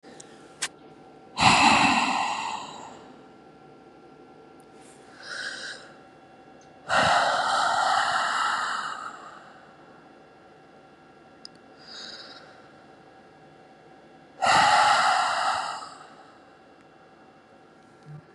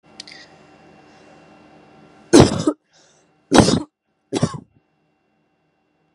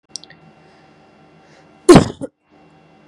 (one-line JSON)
{"exhalation_length": "18.3 s", "exhalation_amplitude": 19365, "exhalation_signal_mean_std_ratio": 0.47, "three_cough_length": "6.1 s", "three_cough_amplitude": 32768, "three_cough_signal_mean_std_ratio": 0.26, "cough_length": "3.1 s", "cough_amplitude": 32768, "cough_signal_mean_std_ratio": 0.21, "survey_phase": "beta (2021-08-13 to 2022-03-07)", "age": "18-44", "gender": "Female", "wearing_mask": "No", "symptom_none": true, "smoker_status": "Ex-smoker", "respiratory_condition_asthma": false, "respiratory_condition_other": false, "recruitment_source": "REACT", "submission_delay": "2 days", "covid_test_result": "Negative", "covid_test_method": "RT-qPCR", "influenza_a_test_result": "Negative", "influenza_b_test_result": "Negative"}